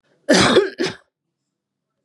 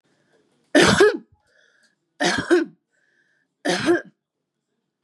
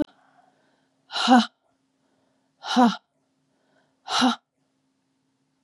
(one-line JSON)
{"cough_length": "2.0 s", "cough_amplitude": 28864, "cough_signal_mean_std_ratio": 0.4, "three_cough_length": "5.0 s", "three_cough_amplitude": 27339, "three_cough_signal_mean_std_ratio": 0.37, "exhalation_length": "5.6 s", "exhalation_amplitude": 20386, "exhalation_signal_mean_std_ratio": 0.29, "survey_phase": "beta (2021-08-13 to 2022-03-07)", "age": "45-64", "gender": "Female", "wearing_mask": "No", "symptom_cough_any": true, "symptom_runny_or_blocked_nose": true, "symptom_fatigue": true, "symptom_fever_high_temperature": true, "smoker_status": "Ex-smoker", "respiratory_condition_asthma": false, "respiratory_condition_other": false, "recruitment_source": "Test and Trace", "submission_delay": "1 day", "covid_test_result": "Positive", "covid_test_method": "RT-qPCR"}